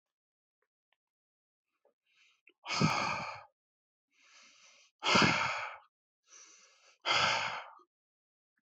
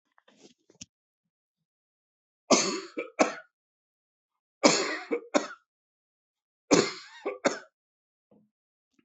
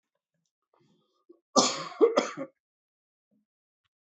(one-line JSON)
{"exhalation_length": "8.7 s", "exhalation_amplitude": 7495, "exhalation_signal_mean_std_ratio": 0.36, "three_cough_length": "9.0 s", "three_cough_amplitude": 23365, "three_cough_signal_mean_std_ratio": 0.28, "cough_length": "4.0 s", "cough_amplitude": 20250, "cough_signal_mean_std_ratio": 0.27, "survey_phase": "beta (2021-08-13 to 2022-03-07)", "age": "45-64", "gender": "Male", "wearing_mask": "No", "symptom_runny_or_blocked_nose": true, "symptom_shortness_of_breath": true, "symptom_sore_throat": true, "symptom_fatigue": true, "symptom_headache": true, "symptom_onset": "12 days", "smoker_status": "Never smoked", "respiratory_condition_asthma": false, "respiratory_condition_other": false, "recruitment_source": "REACT", "submission_delay": "1 day", "covid_test_result": "Negative", "covid_test_method": "RT-qPCR"}